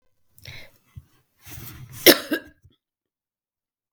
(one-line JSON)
{"cough_length": "3.9 s", "cough_amplitude": 32768, "cough_signal_mean_std_ratio": 0.19, "survey_phase": "beta (2021-08-13 to 2022-03-07)", "age": "65+", "gender": "Female", "wearing_mask": "No", "symptom_cough_any": true, "symptom_runny_or_blocked_nose": true, "symptom_sore_throat": true, "symptom_headache": true, "smoker_status": "Never smoked", "respiratory_condition_asthma": false, "respiratory_condition_other": false, "recruitment_source": "Test and Trace", "submission_delay": "1 day", "covid_test_result": "Negative", "covid_test_method": "RT-qPCR"}